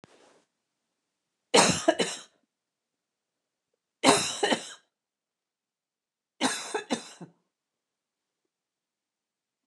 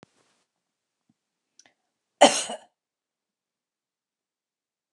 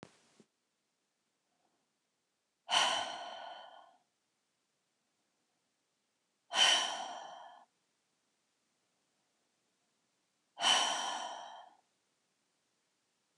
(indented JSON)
{
  "three_cough_length": "9.7 s",
  "three_cough_amplitude": 20672,
  "three_cough_signal_mean_std_ratio": 0.27,
  "cough_length": "4.9 s",
  "cough_amplitude": 29183,
  "cough_signal_mean_std_ratio": 0.14,
  "exhalation_length": "13.4 s",
  "exhalation_amplitude": 6108,
  "exhalation_signal_mean_std_ratio": 0.29,
  "survey_phase": "beta (2021-08-13 to 2022-03-07)",
  "age": "45-64",
  "gender": "Female",
  "wearing_mask": "No",
  "symptom_none": true,
  "smoker_status": "Ex-smoker",
  "respiratory_condition_asthma": false,
  "respiratory_condition_other": false,
  "recruitment_source": "REACT",
  "submission_delay": "1 day",
  "covid_test_result": "Negative",
  "covid_test_method": "RT-qPCR"
}